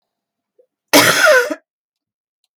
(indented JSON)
{
  "cough_length": "2.6 s",
  "cough_amplitude": 32768,
  "cough_signal_mean_std_ratio": 0.39,
  "survey_phase": "beta (2021-08-13 to 2022-03-07)",
  "age": "65+",
  "gender": "Female",
  "wearing_mask": "No",
  "symptom_none": true,
  "smoker_status": "Never smoked",
  "respiratory_condition_asthma": false,
  "respiratory_condition_other": false,
  "recruitment_source": "REACT",
  "submission_delay": "0 days",
  "covid_test_result": "Negative",
  "covid_test_method": "RT-qPCR",
  "influenza_a_test_result": "Negative",
  "influenza_b_test_result": "Negative"
}